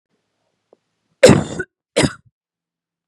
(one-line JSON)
{"cough_length": "3.1 s", "cough_amplitude": 32768, "cough_signal_mean_std_ratio": 0.25, "survey_phase": "beta (2021-08-13 to 2022-03-07)", "age": "18-44", "gender": "Female", "wearing_mask": "No", "symptom_none": true, "smoker_status": "Never smoked", "respiratory_condition_asthma": true, "respiratory_condition_other": false, "recruitment_source": "REACT", "submission_delay": "0 days", "covid_test_result": "Negative", "covid_test_method": "RT-qPCR"}